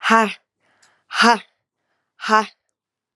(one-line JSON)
{"exhalation_length": "3.2 s", "exhalation_amplitude": 31795, "exhalation_signal_mean_std_ratio": 0.35, "survey_phase": "alpha (2021-03-01 to 2021-08-12)", "age": "18-44", "gender": "Female", "wearing_mask": "No", "symptom_cough_any": true, "symptom_fatigue": true, "symptom_headache": true, "symptom_change_to_sense_of_smell_or_taste": true, "symptom_loss_of_taste": true, "symptom_onset": "3 days", "smoker_status": "Current smoker (11 or more cigarettes per day)", "respiratory_condition_asthma": false, "respiratory_condition_other": false, "recruitment_source": "Test and Trace", "submission_delay": "1 day", "covid_test_result": "Positive", "covid_test_method": "RT-qPCR", "covid_ct_value": 13.6, "covid_ct_gene": "ORF1ab gene", "covid_ct_mean": 14.0, "covid_viral_load": "26000000 copies/ml", "covid_viral_load_category": "High viral load (>1M copies/ml)"}